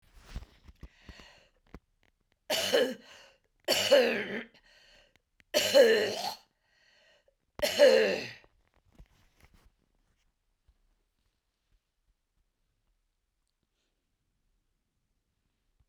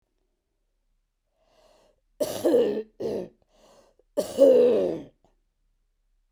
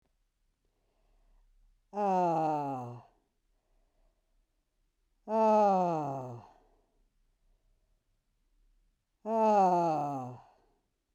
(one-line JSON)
{"three_cough_length": "15.9 s", "three_cough_amplitude": 12381, "three_cough_signal_mean_std_ratio": 0.3, "cough_length": "6.3 s", "cough_amplitude": 15960, "cough_signal_mean_std_ratio": 0.37, "exhalation_length": "11.1 s", "exhalation_amplitude": 5682, "exhalation_signal_mean_std_ratio": 0.44, "survey_phase": "beta (2021-08-13 to 2022-03-07)", "age": "65+", "gender": "Female", "wearing_mask": "No", "symptom_cough_any": true, "symptom_onset": "8 days", "smoker_status": "Ex-smoker", "respiratory_condition_asthma": false, "respiratory_condition_other": false, "recruitment_source": "REACT", "submission_delay": "1 day", "covid_test_result": "Negative", "covid_test_method": "RT-qPCR"}